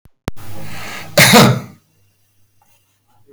{"cough_length": "3.3 s", "cough_amplitude": 32768, "cough_signal_mean_std_ratio": 0.41, "survey_phase": "beta (2021-08-13 to 2022-03-07)", "age": "65+", "gender": "Male", "wearing_mask": "No", "symptom_none": true, "smoker_status": "Ex-smoker", "respiratory_condition_asthma": false, "respiratory_condition_other": true, "recruitment_source": "REACT", "submission_delay": "8 days", "covid_test_result": "Negative", "covid_test_method": "RT-qPCR", "covid_ct_value": 42.0, "covid_ct_gene": "N gene"}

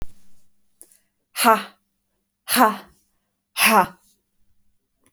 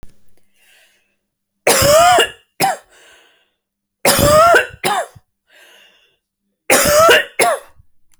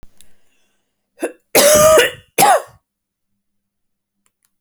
{"exhalation_length": "5.1 s", "exhalation_amplitude": 28754, "exhalation_signal_mean_std_ratio": 0.32, "three_cough_length": "8.2 s", "three_cough_amplitude": 32768, "three_cough_signal_mean_std_ratio": 0.47, "cough_length": "4.6 s", "cough_amplitude": 32768, "cough_signal_mean_std_ratio": 0.37, "survey_phase": "alpha (2021-03-01 to 2021-08-12)", "age": "18-44", "gender": "Female", "wearing_mask": "No", "symptom_none": true, "smoker_status": "Never smoked", "respiratory_condition_asthma": false, "respiratory_condition_other": false, "recruitment_source": "REACT", "submission_delay": "2 days", "covid_test_result": "Negative", "covid_test_method": "RT-qPCR"}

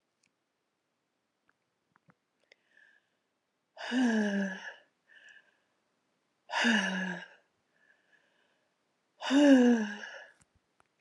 {"exhalation_length": "11.0 s", "exhalation_amplitude": 8556, "exhalation_signal_mean_std_ratio": 0.34, "survey_phase": "beta (2021-08-13 to 2022-03-07)", "age": "45-64", "gender": "Female", "wearing_mask": "No", "symptom_none": true, "smoker_status": "Never smoked", "respiratory_condition_asthma": false, "respiratory_condition_other": false, "recruitment_source": "REACT", "submission_delay": "1 day", "covid_test_result": "Negative", "covid_test_method": "RT-qPCR", "influenza_a_test_result": "Negative", "influenza_b_test_result": "Negative"}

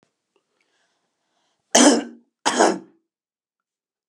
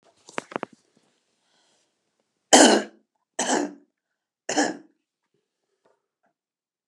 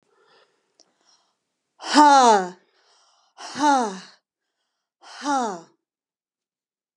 {"cough_length": "4.1 s", "cough_amplitude": 32767, "cough_signal_mean_std_ratio": 0.28, "three_cough_length": "6.9 s", "three_cough_amplitude": 32275, "three_cough_signal_mean_std_ratio": 0.24, "exhalation_length": "7.0 s", "exhalation_amplitude": 30790, "exhalation_signal_mean_std_ratio": 0.32, "survey_phase": "alpha (2021-03-01 to 2021-08-12)", "age": "65+", "gender": "Female", "wearing_mask": "No", "symptom_none": true, "smoker_status": "Never smoked", "respiratory_condition_asthma": false, "respiratory_condition_other": false, "recruitment_source": "REACT", "submission_delay": "3 days", "covid_test_result": "Negative", "covid_test_method": "RT-qPCR"}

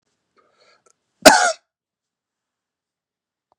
{"cough_length": "3.6 s", "cough_amplitude": 32768, "cough_signal_mean_std_ratio": 0.19, "survey_phase": "beta (2021-08-13 to 2022-03-07)", "age": "45-64", "gender": "Male", "wearing_mask": "No", "symptom_fatigue": true, "smoker_status": "Ex-smoker", "respiratory_condition_asthma": false, "respiratory_condition_other": false, "recruitment_source": "REACT", "submission_delay": "1 day", "covid_test_result": "Negative", "covid_test_method": "RT-qPCR", "influenza_a_test_result": "Negative", "influenza_b_test_result": "Negative"}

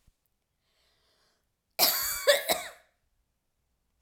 {"cough_length": "4.0 s", "cough_amplitude": 12665, "cough_signal_mean_std_ratio": 0.31, "survey_phase": "alpha (2021-03-01 to 2021-08-12)", "age": "45-64", "gender": "Female", "wearing_mask": "No", "symptom_none": true, "smoker_status": "Never smoked", "respiratory_condition_asthma": false, "respiratory_condition_other": false, "recruitment_source": "REACT", "submission_delay": "1 day", "covid_test_result": "Negative", "covid_test_method": "RT-qPCR"}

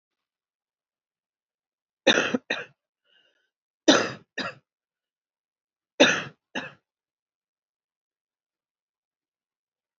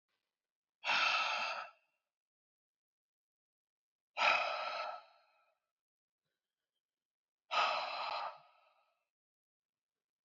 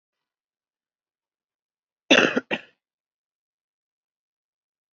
{"three_cough_length": "10.0 s", "three_cough_amplitude": 26765, "three_cough_signal_mean_std_ratio": 0.21, "exhalation_length": "10.2 s", "exhalation_amplitude": 4131, "exhalation_signal_mean_std_ratio": 0.37, "cough_length": "4.9 s", "cough_amplitude": 26103, "cough_signal_mean_std_ratio": 0.17, "survey_phase": "beta (2021-08-13 to 2022-03-07)", "age": "18-44", "wearing_mask": "No", "symptom_cough_any": true, "symptom_runny_or_blocked_nose": true, "symptom_sore_throat": true, "symptom_diarrhoea": true, "symptom_headache": true, "symptom_other": true, "symptom_onset": "2 days", "smoker_status": "Current smoker (e-cigarettes or vapes only)", "respiratory_condition_asthma": false, "respiratory_condition_other": false, "recruitment_source": "Test and Trace", "submission_delay": "1 day", "covid_test_result": "Positive", "covid_test_method": "RT-qPCR", "covid_ct_value": 18.0, "covid_ct_gene": "ORF1ab gene", "covid_ct_mean": 18.5, "covid_viral_load": "840000 copies/ml", "covid_viral_load_category": "Low viral load (10K-1M copies/ml)"}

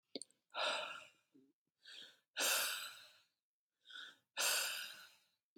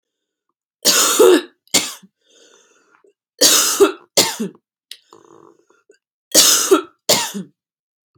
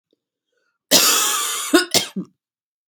{"exhalation_length": "5.6 s", "exhalation_amplitude": 2535, "exhalation_signal_mean_std_ratio": 0.46, "three_cough_length": "8.2 s", "three_cough_amplitude": 32768, "three_cough_signal_mean_std_ratio": 0.4, "cough_length": "2.9 s", "cough_amplitude": 32767, "cough_signal_mean_std_ratio": 0.47, "survey_phase": "beta (2021-08-13 to 2022-03-07)", "age": "18-44", "gender": "Female", "wearing_mask": "No", "symptom_none": true, "smoker_status": "Never smoked", "respiratory_condition_asthma": false, "respiratory_condition_other": false, "recruitment_source": "REACT", "submission_delay": "1 day", "covid_test_result": "Negative", "covid_test_method": "RT-qPCR", "influenza_a_test_result": "Negative", "influenza_b_test_result": "Negative"}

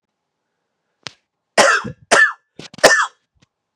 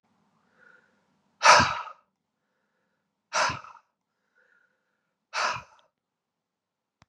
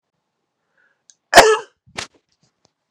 {"three_cough_length": "3.8 s", "three_cough_amplitude": 32768, "three_cough_signal_mean_std_ratio": 0.34, "exhalation_length": "7.1 s", "exhalation_amplitude": 28911, "exhalation_signal_mean_std_ratio": 0.23, "cough_length": "2.9 s", "cough_amplitude": 32768, "cough_signal_mean_std_ratio": 0.23, "survey_phase": "beta (2021-08-13 to 2022-03-07)", "age": "45-64", "gender": "Male", "wearing_mask": "No", "symptom_runny_or_blocked_nose": true, "symptom_headache": true, "symptom_onset": "4 days", "smoker_status": "Never smoked", "respiratory_condition_asthma": false, "respiratory_condition_other": false, "recruitment_source": "Test and Trace", "submission_delay": "2 days", "covid_test_result": "Positive", "covid_test_method": "RT-qPCR", "covid_ct_value": 16.1, "covid_ct_gene": "ORF1ab gene", "covid_ct_mean": 17.2, "covid_viral_load": "2300000 copies/ml", "covid_viral_load_category": "High viral load (>1M copies/ml)"}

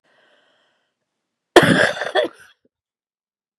{"cough_length": "3.6 s", "cough_amplitude": 32768, "cough_signal_mean_std_ratio": 0.29, "survey_phase": "beta (2021-08-13 to 2022-03-07)", "age": "45-64", "gender": "Female", "wearing_mask": "No", "symptom_cough_any": true, "symptom_loss_of_taste": true, "smoker_status": "Never smoked", "respiratory_condition_asthma": false, "respiratory_condition_other": false, "recruitment_source": "REACT", "submission_delay": "1 day", "covid_test_result": "Negative", "covid_test_method": "RT-qPCR", "influenza_a_test_result": "Negative", "influenza_b_test_result": "Negative"}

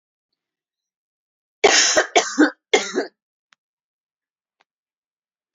{"three_cough_length": "5.5 s", "three_cough_amplitude": 28977, "three_cough_signal_mean_std_ratio": 0.3, "survey_phase": "beta (2021-08-13 to 2022-03-07)", "age": "45-64", "gender": "Female", "wearing_mask": "No", "symptom_cough_any": true, "symptom_headache": true, "symptom_onset": "12 days", "smoker_status": "Ex-smoker", "respiratory_condition_asthma": false, "respiratory_condition_other": false, "recruitment_source": "REACT", "submission_delay": "1 day", "covid_test_result": "Negative", "covid_test_method": "RT-qPCR", "influenza_a_test_result": "Negative", "influenza_b_test_result": "Negative"}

